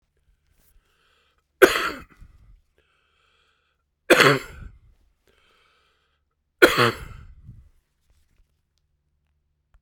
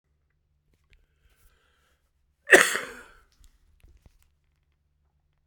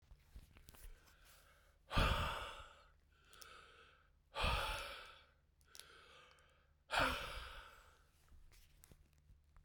{"three_cough_length": "9.8 s", "three_cough_amplitude": 32768, "three_cough_signal_mean_std_ratio": 0.22, "cough_length": "5.5 s", "cough_amplitude": 32767, "cough_signal_mean_std_ratio": 0.16, "exhalation_length": "9.6 s", "exhalation_amplitude": 2450, "exhalation_signal_mean_std_ratio": 0.39, "survey_phase": "beta (2021-08-13 to 2022-03-07)", "age": "45-64", "gender": "Male", "wearing_mask": "No", "symptom_cough_any": true, "symptom_headache": true, "symptom_onset": "3 days", "smoker_status": "Never smoked", "respiratory_condition_asthma": false, "respiratory_condition_other": false, "recruitment_source": "Test and Trace", "submission_delay": "2 days", "covid_test_result": "Positive", "covid_test_method": "RT-qPCR", "covid_ct_value": 17.4, "covid_ct_gene": "ORF1ab gene", "covid_ct_mean": 17.5, "covid_viral_load": "1900000 copies/ml", "covid_viral_load_category": "High viral load (>1M copies/ml)"}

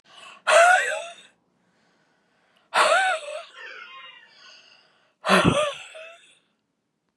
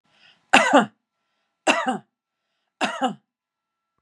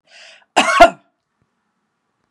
{"exhalation_length": "7.2 s", "exhalation_amplitude": 20991, "exhalation_signal_mean_std_ratio": 0.39, "three_cough_length": "4.0 s", "three_cough_amplitude": 32767, "three_cough_signal_mean_std_ratio": 0.32, "cough_length": "2.3 s", "cough_amplitude": 32768, "cough_signal_mean_std_ratio": 0.27, "survey_phase": "beta (2021-08-13 to 2022-03-07)", "age": "45-64", "gender": "Female", "wearing_mask": "No", "symptom_none": true, "smoker_status": "Ex-smoker", "respiratory_condition_asthma": false, "respiratory_condition_other": false, "recruitment_source": "REACT", "submission_delay": "6 days", "covid_test_result": "Negative", "covid_test_method": "RT-qPCR", "influenza_a_test_result": "Negative", "influenza_b_test_result": "Negative"}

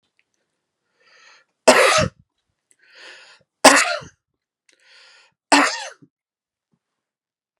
{"three_cough_length": "7.6 s", "three_cough_amplitude": 32768, "three_cough_signal_mean_std_ratio": 0.27, "survey_phase": "beta (2021-08-13 to 2022-03-07)", "age": "18-44", "gender": "Male", "wearing_mask": "No", "symptom_none": true, "smoker_status": "Never smoked", "respiratory_condition_asthma": false, "respiratory_condition_other": false, "recruitment_source": "REACT", "submission_delay": "1 day", "covid_test_result": "Negative", "covid_test_method": "RT-qPCR", "influenza_a_test_result": "Negative", "influenza_b_test_result": "Negative"}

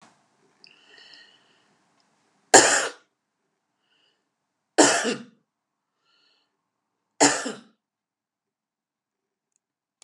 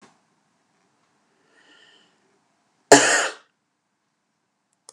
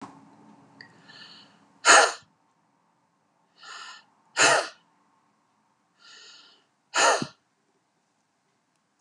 {"three_cough_length": "10.0 s", "three_cough_amplitude": 32725, "three_cough_signal_mean_std_ratio": 0.22, "cough_length": "4.9 s", "cough_amplitude": 32768, "cough_signal_mean_std_ratio": 0.19, "exhalation_length": "9.0 s", "exhalation_amplitude": 24420, "exhalation_signal_mean_std_ratio": 0.25, "survey_phase": "beta (2021-08-13 to 2022-03-07)", "age": "45-64", "gender": "Female", "wearing_mask": "No", "symptom_none": true, "smoker_status": "Ex-smoker", "respiratory_condition_asthma": false, "respiratory_condition_other": false, "recruitment_source": "REACT", "submission_delay": "1 day", "covid_test_result": "Negative", "covid_test_method": "RT-qPCR", "influenza_a_test_result": "Negative", "influenza_b_test_result": "Negative"}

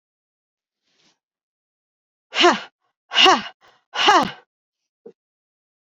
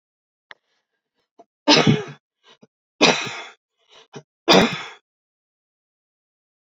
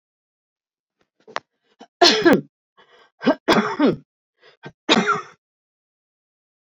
{"exhalation_length": "6.0 s", "exhalation_amplitude": 29756, "exhalation_signal_mean_std_ratio": 0.28, "three_cough_length": "6.7 s", "three_cough_amplitude": 29235, "three_cough_signal_mean_std_ratio": 0.28, "cough_length": "6.7 s", "cough_amplitude": 30851, "cough_signal_mean_std_ratio": 0.33, "survey_phase": "beta (2021-08-13 to 2022-03-07)", "age": "45-64", "gender": "Female", "wearing_mask": "No", "symptom_runny_or_blocked_nose": true, "symptom_onset": "4 days", "smoker_status": "Ex-smoker", "respiratory_condition_asthma": false, "respiratory_condition_other": false, "recruitment_source": "REACT", "submission_delay": "2 days", "covid_test_result": "Negative", "covid_test_method": "RT-qPCR", "influenza_a_test_result": "Negative", "influenza_b_test_result": "Negative"}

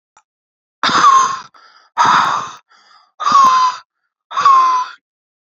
{"exhalation_length": "5.5 s", "exhalation_amplitude": 32768, "exhalation_signal_mean_std_ratio": 0.56, "survey_phase": "alpha (2021-03-01 to 2021-08-12)", "age": "18-44", "gender": "Male", "wearing_mask": "No", "symptom_none": true, "symptom_cough_any": true, "symptom_onset": "4 days", "smoker_status": "Current smoker (1 to 10 cigarettes per day)", "respiratory_condition_asthma": false, "respiratory_condition_other": false, "recruitment_source": "Test and Trace", "submission_delay": "2 days", "covid_test_result": "Positive", "covid_test_method": "RT-qPCR", "covid_ct_value": 14.0, "covid_ct_gene": "ORF1ab gene", "covid_ct_mean": 14.3, "covid_viral_load": "21000000 copies/ml", "covid_viral_load_category": "High viral load (>1M copies/ml)"}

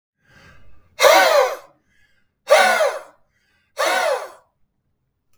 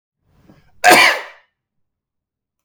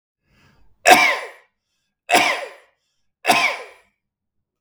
{"exhalation_length": "5.4 s", "exhalation_amplitude": 32768, "exhalation_signal_mean_std_ratio": 0.42, "cough_length": "2.6 s", "cough_amplitude": 32768, "cough_signal_mean_std_ratio": 0.29, "three_cough_length": "4.6 s", "three_cough_amplitude": 32768, "three_cough_signal_mean_std_ratio": 0.35, "survey_phase": "beta (2021-08-13 to 2022-03-07)", "age": "45-64", "gender": "Male", "wearing_mask": "No", "symptom_none": true, "smoker_status": "Never smoked", "respiratory_condition_asthma": false, "respiratory_condition_other": false, "recruitment_source": "REACT", "submission_delay": "1 day", "covid_test_result": "Negative", "covid_test_method": "RT-qPCR"}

